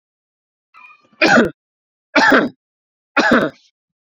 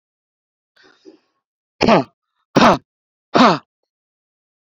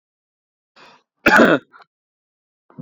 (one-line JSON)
{"three_cough_length": "4.1 s", "three_cough_amplitude": 32767, "three_cough_signal_mean_std_ratio": 0.39, "exhalation_length": "4.6 s", "exhalation_amplitude": 29971, "exhalation_signal_mean_std_ratio": 0.29, "cough_length": "2.8 s", "cough_amplitude": 27983, "cough_signal_mean_std_ratio": 0.27, "survey_phase": "beta (2021-08-13 to 2022-03-07)", "age": "18-44", "gender": "Male", "wearing_mask": "No", "symptom_none": true, "smoker_status": "Never smoked", "respiratory_condition_asthma": true, "respiratory_condition_other": false, "recruitment_source": "REACT", "submission_delay": "2 days", "covid_test_result": "Negative", "covid_test_method": "RT-qPCR"}